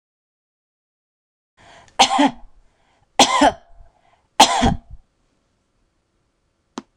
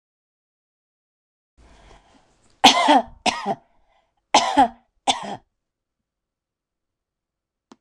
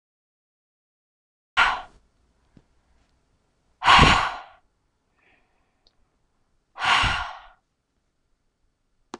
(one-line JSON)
{"three_cough_length": "7.0 s", "three_cough_amplitude": 26028, "three_cough_signal_mean_std_ratio": 0.29, "cough_length": "7.8 s", "cough_amplitude": 26028, "cough_signal_mean_std_ratio": 0.27, "exhalation_length": "9.2 s", "exhalation_amplitude": 25384, "exhalation_signal_mean_std_ratio": 0.27, "survey_phase": "alpha (2021-03-01 to 2021-08-12)", "age": "45-64", "gender": "Female", "wearing_mask": "No", "symptom_none": true, "smoker_status": "Ex-smoker", "respiratory_condition_asthma": false, "respiratory_condition_other": false, "recruitment_source": "REACT", "submission_delay": "1 day", "covid_test_result": "Negative", "covid_test_method": "RT-qPCR"}